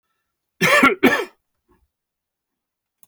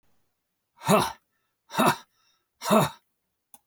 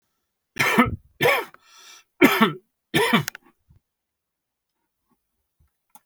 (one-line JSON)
{"cough_length": "3.1 s", "cough_amplitude": 28981, "cough_signal_mean_std_ratio": 0.33, "exhalation_length": "3.7 s", "exhalation_amplitude": 16528, "exhalation_signal_mean_std_ratio": 0.34, "three_cough_length": "6.1 s", "three_cough_amplitude": 29419, "three_cough_signal_mean_std_ratio": 0.33, "survey_phase": "beta (2021-08-13 to 2022-03-07)", "age": "65+", "gender": "Male", "wearing_mask": "No", "symptom_none": true, "symptom_onset": "13 days", "smoker_status": "Never smoked", "respiratory_condition_asthma": false, "respiratory_condition_other": false, "recruitment_source": "REACT", "submission_delay": "3 days", "covid_test_result": "Negative", "covid_test_method": "RT-qPCR"}